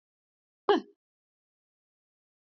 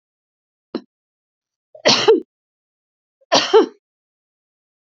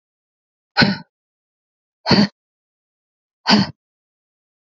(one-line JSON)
{"cough_length": "2.6 s", "cough_amplitude": 10725, "cough_signal_mean_std_ratio": 0.17, "three_cough_length": "4.9 s", "three_cough_amplitude": 32767, "three_cough_signal_mean_std_ratio": 0.28, "exhalation_length": "4.7 s", "exhalation_amplitude": 30827, "exhalation_signal_mean_std_ratio": 0.28, "survey_phase": "beta (2021-08-13 to 2022-03-07)", "age": "45-64", "gender": "Female", "wearing_mask": "No", "symptom_headache": true, "smoker_status": "Ex-smoker", "respiratory_condition_asthma": false, "respiratory_condition_other": false, "recruitment_source": "REACT", "submission_delay": "2 days", "covid_test_result": "Negative", "covid_test_method": "RT-qPCR", "influenza_a_test_result": "Negative", "influenza_b_test_result": "Negative"}